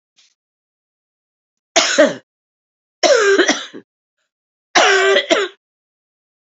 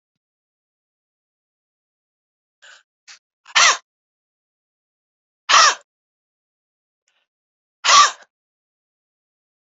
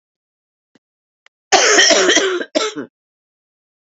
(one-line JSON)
{"three_cough_length": "6.6 s", "three_cough_amplitude": 31065, "three_cough_signal_mean_std_ratio": 0.4, "exhalation_length": "9.6 s", "exhalation_amplitude": 31435, "exhalation_signal_mean_std_ratio": 0.21, "cough_length": "3.9 s", "cough_amplitude": 31569, "cough_signal_mean_std_ratio": 0.43, "survey_phase": "beta (2021-08-13 to 2022-03-07)", "age": "45-64", "gender": "Female", "wearing_mask": "No", "symptom_cough_any": true, "symptom_runny_or_blocked_nose": true, "symptom_fatigue": true, "symptom_fever_high_temperature": true, "symptom_headache": true, "symptom_loss_of_taste": true, "smoker_status": "Never smoked", "respiratory_condition_asthma": true, "respiratory_condition_other": false, "recruitment_source": "Test and Trace", "submission_delay": "2 days", "covid_test_result": "Positive", "covid_test_method": "RT-qPCR"}